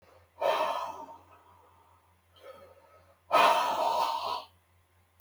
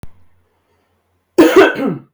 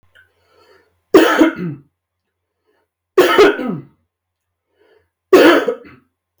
{
  "exhalation_length": "5.2 s",
  "exhalation_amplitude": 9839,
  "exhalation_signal_mean_std_ratio": 0.47,
  "cough_length": "2.1 s",
  "cough_amplitude": 32768,
  "cough_signal_mean_std_ratio": 0.4,
  "three_cough_length": "6.4 s",
  "three_cough_amplitude": 32768,
  "three_cough_signal_mean_std_ratio": 0.37,
  "survey_phase": "beta (2021-08-13 to 2022-03-07)",
  "age": "18-44",
  "gender": "Male",
  "wearing_mask": "No",
  "symptom_none": true,
  "smoker_status": "Never smoked",
  "respiratory_condition_asthma": false,
  "respiratory_condition_other": false,
  "recruitment_source": "REACT",
  "submission_delay": "2 days",
  "covid_test_result": "Negative",
  "covid_test_method": "RT-qPCR"
}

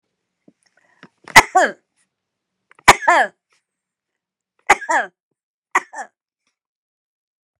{
  "cough_length": "7.6 s",
  "cough_amplitude": 32768,
  "cough_signal_mean_std_ratio": 0.23,
  "survey_phase": "beta (2021-08-13 to 2022-03-07)",
  "age": "65+",
  "gender": "Female",
  "wearing_mask": "No",
  "symptom_shortness_of_breath": true,
  "smoker_status": "Ex-smoker",
  "respiratory_condition_asthma": true,
  "respiratory_condition_other": true,
  "recruitment_source": "REACT",
  "submission_delay": "1 day",
  "covid_test_result": "Negative",
  "covid_test_method": "RT-qPCR"
}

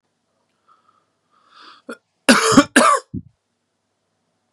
{
  "cough_length": "4.5 s",
  "cough_amplitude": 32767,
  "cough_signal_mean_std_ratio": 0.29,
  "survey_phase": "beta (2021-08-13 to 2022-03-07)",
  "age": "18-44",
  "gender": "Male",
  "wearing_mask": "No",
  "symptom_cough_any": true,
  "symptom_new_continuous_cough": true,
  "symptom_sore_throat": true,
  "symptom_fatigue": true,
  "symptom_change_to_sense_of_smell_or_taste": true,
  "symptom_onset": "5 days",
  "smoker_status": "Ex-smoker",
  "respiratory_condition_asthma": false,
  "respiratory_condition_other": false,
  "recruitment_source": "Test and Trace",
  "submission_delay": "2 days",
  "covid_test_result": "Positive",
  "covid_test_method": "RT-qPCR",
  "covid_ct_value": 18.2,
  "covid_ct_gene": "ORF1ab gene",
  "covid_ct_mean": 18.5,
  "covid_viral_load": "850000 copies/ml",
  "covid_viral_load_category": "Low viral load (10K-1M copies/ml)"
}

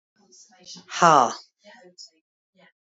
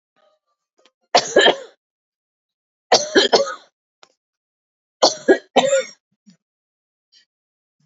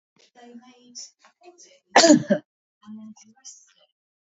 {
  "exhalation_length": "2.8 s",
  "exhalation_amplitude": 27424,
  "exhalation_signal_mean_std_ratio": 0.26,
  "three_cough_length": "7.9 s",
  "three_cough_amplitude": 30811,
  "three_cough_signal_mean_std_ratio": 0.3,
  "cough_length": "4.3 s",
  "cough_amplitude": 27445,
  "cough_signal_mean_std_ratio": 0.24,
  "survey_phase": "beta (2021-08-13 to 2022-03-07)",
  "age": "65+",
  "gender": "Female",
  "wearing_mask": "No",
  "symptom_cough_any": true,
  "smoker_status": "Ex-smoker",
  "respiratory_condition_asthma": false,
  "respiratory_condition_other": false,
  "recruitment_source": "REACT",
  "submission_delay": "2 days",
  "covid_test_result": "Negative",
  "covid_test_method": "RT-qPCR",
  "influenza_a_test_result": "Negative",
  "influenza_b_test_result": "Negative"
}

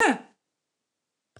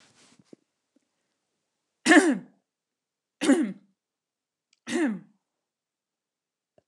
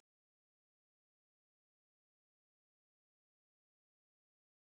{
  "cough_length": "1.4 s",
  "cough_amplitude": 12436,
  "cough_signal_mean_std_ratio": 0.27,
  "three_cough_length": "6.9 s",
  "three_cough_amplitude": 19767,
  "three_cough_signal_mean_std_ratio": 0.26,
  "exhalation_length": "4.7 s",
  "exhalation_amplitude": 19,
  "exhalation_signal_mean_std_ratio": 0.02,
  "survey_phase": "beta (2021-08-13 to 2022-03-07)",
  "age": "45-64",
  "gender": "Female",
  "wearing_mask": "No",
  "symptom_headache": true,
  "smoker_status": "Never smoked",
  "respiratory_condition_asthma": false,
  "respiratory_condition_other": false,
  "recruitment_source": "REACT",
  "submission_delay": "1 day",
  "covid_test_result": "Negative",
  "covid_test_method": "RT-qPCR",
  "influenza_a_test_result": "Negative",
  "influenza_b_test_result": "Negative"
}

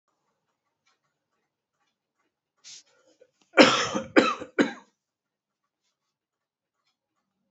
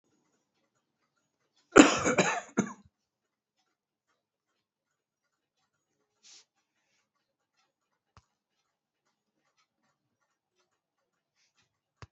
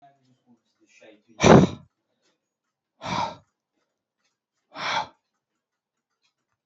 {
  "three_cough_length": "7.5 s",
  "three_cough_amplitude": 27054,
  "three_cough_signal_mean_std_ratio": 0.21,
  "cough_length": "12.1 s",
  "cough_amplitude": 24817,
  "cough_signal_mean_std_ratio": 0.14,
  "exhalation_length": "6.7 s",
  "exhalation_amplitude": 27348,
  "exhalation_signal_mean_std_ratio": 0.21,
  "survey_phase": "alpha (2021-03-01 to 2021-08-12)",
  "age": "45-64",
  "gender": "Male",
  "wearing_mask": "No",
  "symptom_cough_any": true,
  "symptom_shortness_of_breath": true,
  "symptom_fatigue": true,
  "symptom_fever_high_temperature": true,
  "symptom_headache": true,
  "symptom_onset": "3 days",
  "smoker_status": "Never smoked",
  "respiratory_condition_asthma": false,
  "respiratory_condition_other": true,
  "recruitment_source": "Test and Trace",
  "submission_delay": "2 days",
  "covid_test_result": "Positive",
  "covid_test_method": "RT-qPCR"
}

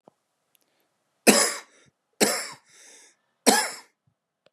{
  "three_cough_length": "4.5 s",
  "three_cough_amplitude": 32343,
  "three_cough_signal_mean_std_ratio": 0.3,
  "survey_phase": "beta (2021-08-13 to 2022-03-07)",
  "age": "45-64",
  "gender": "Male",
  "wearing_mask": "No",
  "symptom_cough_any": true,
  "symptom_runny_or_blocked_nose": true,
  "symptom_fatigue": true,
  "symptom_headache": true,
  "symptom_onset": "3 days",
  "smoker_status": "Current smoker (e-cigarettes or vapes only)",
  "respiratory_condition_asthma": false,
  "respiratory_condition_other": false,
  "recruitment_source": "Test and Trace",
  "submission_delay": "2 days",
  "covid_test_result": "Positive",
  "covid_test_method": "RT-qPCR",
  "covid_ct_value": 15.7,
  "covid_ct_gene": "ORF1ab gene",
  "covid_ct_mean": 16.2,
  "covid_viral_load": "5000000 copies/ml",
  "covid_viral_load_category": "High viral load (>1M copies/ml)"
}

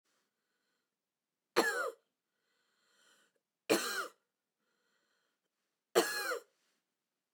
{
  "three_cough_length": "7.3 s",
  "three_cough_amplitude": 6525,
  "three_cough_signal_mean_std_ratio": 0.28,
  "survey_phase": "beta (2021-08-13 to 2022-03-07)",
  "age": "65+",
  "gender": "Female",
  "wearing_mask": "No",
  "symptom_none": true,
  "symptom_onset": "13 days",
  "smoker_status": "Ex-smoker",
  "respiratory_condition_asthma": true,
  "respiratory_condition_other": false,
  "recruitment_source": "REACT",
  "submission_delay": "1 day",
  "covid_test_result": "Negative",
  "covid_test_method": "RT-qPCR",
  "influenza_a_test_result": "Unknown/Void",
  "influenza_b_test_result": "Unknown/Void"
}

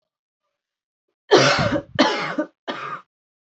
{
  "three_cough_length": "3.4 s",
  "three_cough_amplitude": 27021,
  "three_cough_signal_mean_std_ratio": 0.42,
  "survey_phase": "alpha (2021-03-01 to 2021-08-12)",
  "age": "18-44",
  "gender": "Female",
  "wearing_mask": "No",
  "symptom_cough_any": true,
  "symptom_shortness_of_breath": true,
  "symptom_abdominal_pain": true,
  "symptom_fatigue": true,
  "symptom_onset": "3 days",
  "smoker_status": "Never smoked",
  "respiratory_condition_asthma": false,
  "respiratory_condition_other": false,
  "recruitment_source": "Test and Trace",
  "submission_delay": "2 days",
  "covid_test_result": "Positive",
  "covid_test_method": "RT-qPCR"
}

